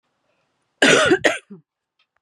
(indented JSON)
{
  "cough_length": "2.2 s",
  "cough_amplitude": 32371,
  "cough_signal_mean_std_ratio": 0.38,
  "survey_phase": "beta (2021-08-13 to 2022-03-07)",
  "age": "18-44",
  "gender": "Female",
  "wearing_mask": "No",
  "symptom_cough_any": true,
  "symptom_runny_or_blocked_nose": true,
  "symptom_fatigue": true,
  "symptom_headache": true,
  "symptom_change_to_sense_of_smell_or_taste": true,
  "symptom_loss_of_taste": true,
  "symptom_onset": "3 days",
  "smoker_status": "Never smoked",
  "respiratory_condition_asthma": false,
  "respiratory_condition_other": false,
  "recruitment_source": "Test and Trace",
  "submission_delay": "2 days",
  "covid_test_result": "Positive",
  "covid_test_method": "RT-qPCR",
  "covid_ct_value": 15.4,
  "covid_ct_gene": "ORF1ab gene",
  "covid_ct_mean": 15.8,
  "covid_viral_load": "6400000 copies/ml",
  "covid_viral_load_category": "High viral load (>1M copies/ml)"
}